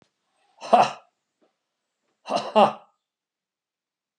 {"cough_length": "4.2 s", "cough_amplitude": 25397, "cough_signal_mean_std_ratio": 0.25, "survey_phase": "alpha (2021-03-01 to 2021-08-12)", "age": "45-64", "gender": "Male", "wearing_mask": "No", "symptom_none": true, "smoker_status": "Never smoked", "respiratory_condition_asthma": true, "respiratory_condition_other": false, "recruitment_source": "REACT", "submission_delay": "2 days", "covid_test_result": "Negative", "covid_test_method": "RT-qPCR"}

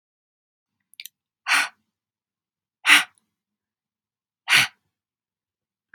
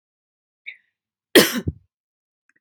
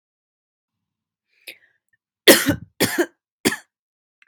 {"exhalation_length": "5.9 s", "exhalation_amplitude": 29335, "exhalation_signal_mean_std_ratio": 0.22, "cough_length": "2.6 s", "cough_amplitude": 32768, "cough_signal_mean_std_ratio": 0.21, "three_cough_length": "4.3 s", "three_cough_amplitude": 32767, "three_cough_signal_mean_std_ratio": 0.24, "survey_phase": "beta (2021-08-13 to 2022-03-07)", "age": "45-64", "gender": "Female", "wearing_mask": "No", "symptom_none": true, "smoker_status": "Never smoked", "respiratory_condition_asthma": false, "respiratory_condition_other": false, "recruitment_source": "REACT", "submission_delay": "0 days", "covid_test_result": "Negative", "covid_test_method": "RT-qPCR", "influenza_a_test_result": "Negative", "influenza_b_test_result": "Negative"}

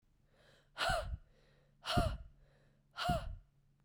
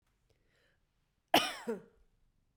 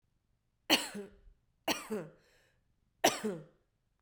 {"exhalation_length": "3.8 s", "exhalation_amplitude": 4048, "exhalation_signal_mean_std_ratio": 0.45, "cough_length": "2.6 s", "cough_amplitude": 7498, "cough_signal_mean_std_ratio": 0.24, "three_cough_length": "4.0 s", "three_cough_amplitude": 8170, "three_cough_signal_mean_std_ratio": 0.32, "survey_phase": "beta (2021-08-13 to 2022-03-07)", "age": "18-44", "gender": "Female", "wearing_mask": "No", "symptom_cough_any": true, "symptom_runny_or_blocked_nose": true, "symptom_sore_throat": true, "symptom_fatigue": true, "symptom_headache": true, "symptom_other": true, "symptom_onset": "3 days", "smoker_status": "Ex-smoker", "respiratory_condition_asthma": false, "respiratory_condition_other": false, "recruitment_source": "Test and Trace", "submission_delay": "2 days", "covid_test_result": "Positive", "covid_test_method": "RT-qPCR"}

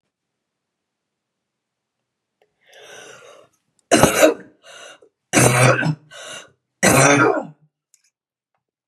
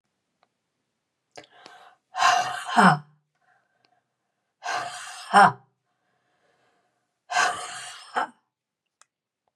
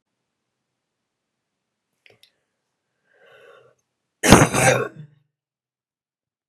{"three_cough_length": "8.9 s", "three_cough_amplitude": 32768, "three_cough_signal_mean_std_ratio": 0.35, "exhalation_length": "9.6 s", "exhalation_amplitude": 22425, "exhalation_signal_mean_std_ratio": 0.29, "cough_length": "6.5 s", "cough_amplitude": 32768, "cough_signal_mean_std_ratio": 0.22, "survey_phase": "beta (2021-08-13 to 2022-03-07)", "age": "45-64", "gender": "Female", "wearing_mask": "No", "symptom_cough_any": true, "symptom_runny_or_blocked_nose": true, "symptom_fever_high_temperature": true, "symptom_headache": true, "symptom_change_to_sense_of_smell_or_taste": true, "symptom_loss_of_taste": true, "smoker_status": "Ex-smoker", "respiratory_condition_asthma": false, "respiratory_condition_other": false, "recruitment_source": "Test and Trace", "submission_delay": "1 day", "covid_test_result": "Positive", "covid_test_method": "RT-qPCR", "covid_ct_value": 12.0, "covid_ct_gene": "ORF1ab gene"}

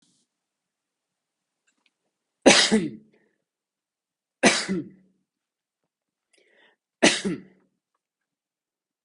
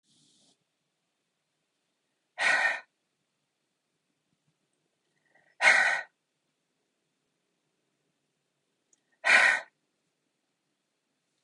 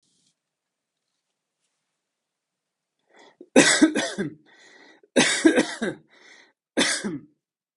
{"three_cough_length": "9.0 s", "three_cough_amplitude": 28749, "three_cough_signal_mean_std_ratio": 0.24, "exhalation_length": "11.4 s", "exhalation_amplitude": 15325, "exhalation_signal_mean_std_ratio": 0.24, "cough_length": "7.8 s", "cough_amplitude": 29480, "cough_signal_mean_std_ratio": 0.33, "survey_phase": "beta (2021-08-13 to 2022-03-07)", "age": "18-44", "gender": "Male", "wearing_mask": "No", "symptom_none": true, "smoker_status": "Never smoked", "respiratory_condition_asthma": false, "respiratory_condition_other": false, "recruitment_source": "REACT", "submission_delay": "1 day", "covid_test_result": "Negative", "covid_test_method": "RT-qPCR"}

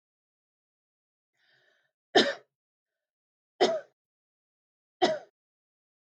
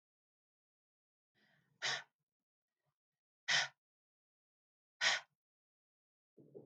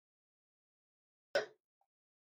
{"three_cough_length": "6.1 s", "three_cough_amplitude": 12835, "three_cough_signal_mean_std_ratio": 0.21, "exhalation_length": "6.7 s", "exhalation_amplitude": 3797, "exhalation_signal_mean_std_ratio": 0.23, "cough_length": "2.2 s", "cough_amplitude": 2814, "cough_signal_mean_std_ratio": 0.16, "survey_phase": "beta (2021-08-13 to 2022-03-07)", "age": "45-64", "gender": "Female", "wearing_mask": "No", "symptom_runny_or_blocked_nose": true, "smoker_status": "Never smoked", "respiratory_condition_asthma": false, "respiratory_condition_other": false, "recruitment_source": "REACT", "submission_delay": "1 day", "covid_test_result": "Negative", "covid_test_method": "RT-qPCR", "influenza_a_test_result": "Negative", "influenza_b_test_result": "Negative"}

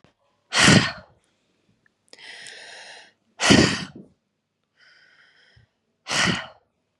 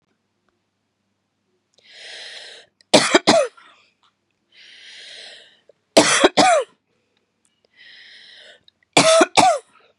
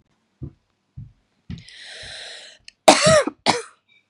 {"exhalation_length": "7.0 s", "exhalation_amplitude": 30240, "exhalation_signal_mean_std_ratio": 0.31, "three_cough_length": "10.0 s", "three_cough_amplitude": 32768, "three_cough_signal_mean_std_ratio": 0.33, "cough_length": "4.1 s", "cough_amplitude": 32768, "cough_signal_mean_std_ratio": 0.3, "survey_phase": "beta (2021-08-13 to 2022-03-07)", "age": "18-44", "gender": "Female", "wearing_mask": "No", "symptom_cough_any": true, "symptom_runny_or_blocked_nose": true, "symptom_shortness_of_breath": true, "symptom_sore_throat": true, "symptom_fatigue": true, "symptom_fever_high_temperature": true, "symptom_headache": true, "symptom_onset": "5 days", "smoker_status": "Never smoked", "respiratory_condition_asthma": true, "respiratory_condition_other": false, "recruitment_source": "Test and Trace", "submission_delay": "2 days", "covid_test_result": "Positive", "covid_test_method": "RT-qPCR", "covid_ct_value": 27.9, "covid_ct_gene": "N gene"}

